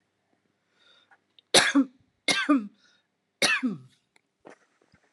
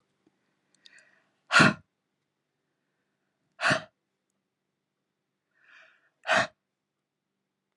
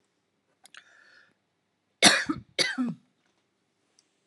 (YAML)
three_cough_length: 5.1 s
three_cough_amplitude: 24452
three_cough_signal_mean_std_ratio: 0.33
exhalation_length: 7.8 s
exhalation_amplitude: 15908
exhalation_signal_mean_std_ratio: 0.21
cough_length: 4.3 s
cough_amplitude: 25275
cough_signal_mean_std_ratio: 0.26
survey_phase: alpha (2021-03-01 to 2021-08-12)
age: 45-64
gender: Female
wearing_mask: 'No'
symptom_none: true
smoker_status: Ex-smoker
respiratory_condition_asthma: false
respiratory_condition_other: false
recruitment_source: REACT
submission_delay: 2 days
covid_test_result: Negative
covid_test_method: RT-qPCR